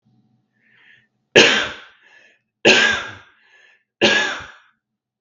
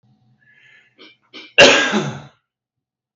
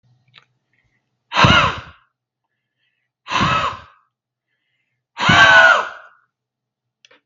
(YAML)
three_cough_length: 5.2 s
three_cough_amplitude: 32768
three_cough_signal_mean_std_ratio: 0.35
cough_length: 3.2 s
cough_amplitude: 32768
cough_signal_mean_std_ratio: 0.31
exhalation_length: 7.3 s
exhalation_amplitude: 32768
exhalation_signal_mean_std_ratio: 0.36
survey_phase: beta (2021-08-13 to 2022-03-07)
age: 18-44
gender: Male
wearing_mask: 'No'
symptom_none: true
smoker_status: Never smoked
respiratory_condition_asthma: false
respiratory_condition_other: false
recruitment_source: REACT
submission_delay: 0 days
covid_test_result: Negative
covid_test_method: RT-qPCR
influenza_a_test_result: Negative
influenza_b_test_result: Negative